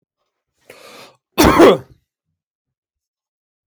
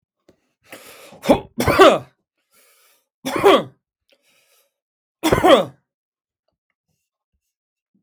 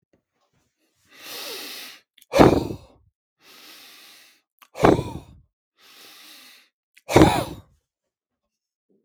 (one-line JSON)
{"cough_length": "3.7 s", "cough_amplitude": 32768, "cough_signal_mean_std_ratio": 0.27, "three_cough_length": "8.0 s", "three_cough_amplitude": 32768, "three_cough_signal_mean_std_ratio": 0.29, "exhalation_length": "9.0 s", "exhalation_amplitude": 32768, "exhalation_signal_mean_std_ratio": 0.26, "survey_phase": "beta (2021-08-13 to 2022-03-07)", "age": "65+", "gender": "Male", "wearing_mask": "No", "symptom_none": true, "smoker_status": "Never smoked", "respiratory_condition_asthma": false, "respiratory_condition_other": false, "recruitment_source": "REACT", "submission_delay": "2 days", "covid_test_result": "Negative", "covid_test_method": "RT-qPCR"}